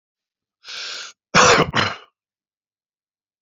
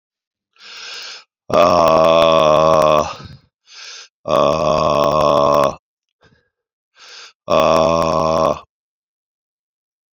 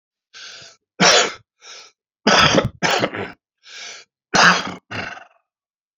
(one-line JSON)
{"cough_length": "3.4 s", "cough_amplitude": 28258, "cough_signal_mean_std_ratio": 0.33, "exhalation_length": "10.2 s", "exhalation_amplitude": 31097, "exhalation_signal_mean_std_ratio": 0.51, "three_cough_length": "6.0 s", "three_cough_amplitude": 31351, "three_cough_signal_mean_std_ratio": 0.41, "survey_phase": "beta (2021-08-13 to 2022-03-07)", "age": "45-64", "gender": "Male", "wearing_mask": "No", "symptom_cough_any": true, "symptom_runny_or_blocked_nose": true, "symptom_shortness_of_breath": true, "symptom_sore_throat": true, "symptom_abdominal_pain": true, "symptom_fatigue": true, "symptom_headache": true, "symptom_change_to_sense_of_smell_or_taste": true, "symptom_onset": "2 days", "smoker_status": "Ex-smoker", "respiratory_condition_asthma": false, "respiratory_condition_other": false, "recruitment_source": "Test and Trace", "submission_delay": "2 days", "covid_test_result": "Positive", "covid_test_method": "RT-qPCR", "covid_ct_value": 20.1, "covid_ct_gene": "ORF1ab gene", "covid_ct_mean": 20.7, "covid_viral_load": "170000 copies/ml", "covid_viral_load_category": "Low viral load (10K-1M copies/ml)"}